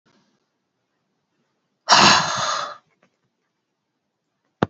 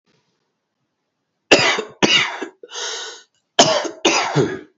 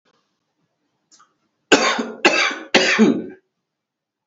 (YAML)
exhalation_length: 4.7 s
exhalation_amplitude: 30551
exhalation_signal_mean_std_ratio: 0.29
cough_length: 4.8 s
cough_amplitude: 32768
cough_signal_mean_std_ratio: 0.45
three_cough_length: 4.3 s
three_cough_amplitude: 30163
three_cough_signal_mean_std_ratio: 0.4
survey_phase: alpha (2021-03-01 to 2021-08-12)
age: 18-44
gender: Male
wearing_mask: 'No'
symptom_none: true
smoker_status: Never smoked
respiratory_condition_asthma: false
respiratory_condition_other: false
recruitment_source: REACT
submission_delay: 1 day
covid_test_result: Negative
covid_test_method: RT-qPCR